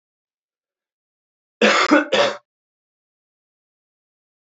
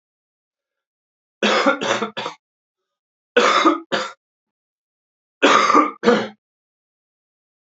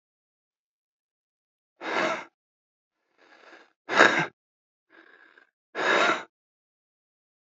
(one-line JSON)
{"cough_length": "4.4 s", "cough_amplitude": 25903, "cough_signal_mean_std_ratio": 0.3, "three_cough_length": "7.8 s", "three_cough_amplitude": 27987, "three_cough_signal_mean_std_ratio": 0.39, "exhalation_length": "7.5 s", "exhalation_amplitude": 28249, "exhalation_signal_mean_std_ratio": 0.28, "survey_phase": "alpha (2021-03-01 to 2021-08-12)", "age": "18-44", "gender": "Male", "wearing_mask": "No", "symptom_cough_any": true, "symptom_shortness_of_breath": true, "symptom_fatigue": true, "symptom_headache": true, "symptom_onset": "2 days", "smoker_status": "Ex-smoker", "respiratory_condition_asthma": false, "respiratory_condition_other": false, "recruitment_source": "Test and Trace", "submission_delay": "1 day", "covid_test_result": "Positive", "covid_test_method": "RT-qPCR", "covid_ct_value": 23.4, "covid_ct_gene": "ORF1ab gene"}